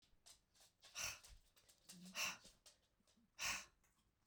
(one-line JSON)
{"exhalation_length": "4.3 s", "exhalation_amplitude": 905, "exhalation_signal_mean_std_ratio": 0.4, "survey_phase": "beta (2021-08-13 to 2022-03-07)", "age": "45-64", "gender": "Female", "wearing_mask": "No", "symptom_cough_any": true, "symptom_new_continuous_cough": true, "symptom_runny_or_blocked_nose": true, "symptom_sore_throat": true, "symptom_fatigue": true, "symptom_headache": true, "symptom_change_to_sense_of_smell_or_taste": true, "symptom_onset": "4 days", "smoker_status": "Never smoked", "respiratory_condition_asthma": true, "respiratory_condition_other": false, "recruitment_source": "Test and Trace", "submission_delay": "3 days", "covid_test_result": "Positive", "covid_test_method": "RT-qPCR", "covid_ct_value": 18.6, "covid_ct_gene": "ORF1ab gene", "covid_ct_mean": 19.1, "covid_viral_load": "560000 copies/ml", "covid_viral_load_category": "Low viral load (10K-1M copies/ml)"}